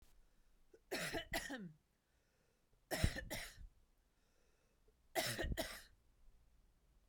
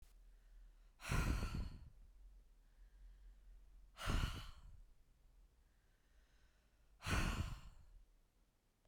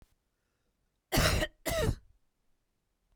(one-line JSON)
{"three_cough_length": "7.1 s", "three_cough_amplitude": 2902, "three_cough_signal_mean_std_ratio": 0.41, "exhalation_length": "8.9 s", "exhalation_amplitude": 1705, "exhalation_signal_mean_std_ratio": 0.45, "cough_length": "3.2 s", "cough_amplitude": 6535, "cough_signal_mean_std_ratio": 0.37, "survey_phase": "beta (2021-08-13 to 2022-03-07)", "age": "45-64", "gender": "Female", "wearing_mask": "No", "symptom_none": true, "smoker_status": "Never smoked", "respiratory_condition_asthma": false, "respiratory_condition_other": false, "recruitment_source": "REACT", "submission_delay": "1 day", "covid_test_result": "Negative", "covid_test_method": "RT-qPCR", "influenza_a_test_result": "Unknown/Void", "influenza_b_test_result": "Unknown/Void"}